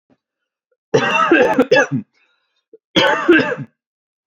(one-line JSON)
{"cough_length": "4.3 s", "cough_amplitude": 29623, "cough_signal_mean_std_ratio": 0.5, "survey_phase": "alpha (2021-03-01 to 2021-08-12)", "age": "18-44", "gender": "Male", "wearing_mask": "No", "symptom_none": true, "smoker_status": "Never smoked", "respiratory_condition_asthma": false, "respiratory_condition_other": false, "recruitment_source": "REACT", "submission_delay": "5 days", "covid_test_result": "Negative", "covid_test_method": "RT-qPCR"}